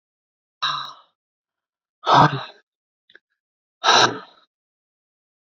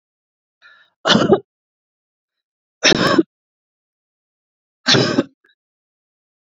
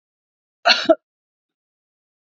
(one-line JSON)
{"exhalation_length": "5.5 s", "exhalation_amplitude": 27619, "exhalation_signal_mean_std_ratio": 0.29, "three_cough_length": "6.5 s", "three_cough_amplitude": 32768, "three_cough_signal_mean_std_ratio": 0.31, "cough_length": "2.3 s", "cough_amplitude": 30186, "cough_signal_mean_std_ratio": 0.23, "survey_phase": "beta (2021-08-13 to 2022-03-07)", "age": "65+", "gender": "Female", "wearing_mask": "No", "symptom_none": true, "smoker_status": "Never smoked", "respiratory_condition_asthma": false, "respiratory_condition_other": false, "recruitment_source": "REACT", "submission_delay": "1 day", "covid_test_result": "Negative", "covid_test_method": "RT-qPCR"}